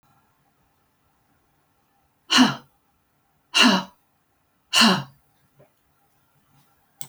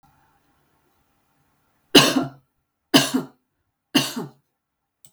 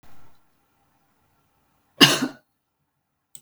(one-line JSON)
{"exhalation_length": "7.1 s", "exhalation_amplitude": 26379, "exhalation_signal_mean_std_ratio": 0.27, "three_cough_length": "5.1 s", "three_cough_amplitude": 32768, "three_cough_signal_mean_std_ratio": 0.27, "cough_length": "3.4 s", "cough_amplitude": 32768, "cough_signal_mean_std_ratio": 0.21, "survey_phase": "beta (2021-08-13 to 2022-03-07)", "age": "65+", "gender": "Female", "wearing_mask": "No", "symptom_none": true, "smoker_status": "Never smoked", "respiratory_condition_asthma": false, "respiratory_condition_other": false, "recruitment_source": "REACT", "submission_delay": "2 days", "covid_test_result": "Negative", "covid_test_method": "RT-qPCR"}